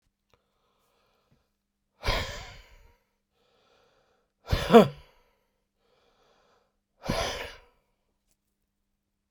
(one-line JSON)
{"exhalation_length": "9.3 s", "exhalation_amplitude": 21933, "exhalation_signal_mean_std_ratio": 0.19, "survey_phase": "beta (2021-08-13 to 2022-03-07)", "age": "65+", "gender": "Male", "wearing_mask": "No", "symptom_none": true, "symptom_onset": "5 days", "smoker_status": "Ex-smoker", "respiratory_condition_asthma": true, "respiratory_condition_other": false, "recruitment_source": "Test and Trace", "submission_delay": "2 days", "covid_test_result": "Positive", "covid_test_method": "RT-qPCR", "covid_ct_value": 21.0, "covid_ct_gene": "ORF1ab gene", "covid_ct_mean": 21.5, "covid_viral_load": "86000 copies/ml", "covid_viral_load_category": "Low viral load (10K-1M copies/ml)"}